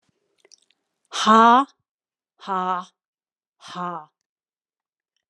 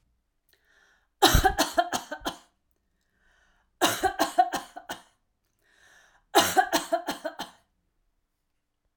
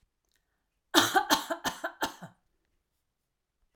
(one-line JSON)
{"exhalation_length": "5.3 s", "exhalation_amplitude": 27545, "exhalation_signal_mean_std_ratio": 0.28, "three_cough_length": "9.0 s", "three_cough_amplitude": 21441, "three_cough_signal_mean_std_ratio": 0.34, "cough_length": "3.8 s", "cough_amplitude": 26730, "cough_signal_mean_std_ratio": 0.31, "survey_phase": "alpha (2021-03-01 to 2021-08-12)", "age": "45-64", "gender": "Female", "wearing_mask": "No", "symptom_none": true, "smoker_status": "Never smoked", "respiratory_condition_asthma": false, "respiratory_condition_other": false, "recruitment_source": "REACT", "submission_delay": "2 days", "covid_test_result": "Negative", "covid_test_method": "RT-qPCR"}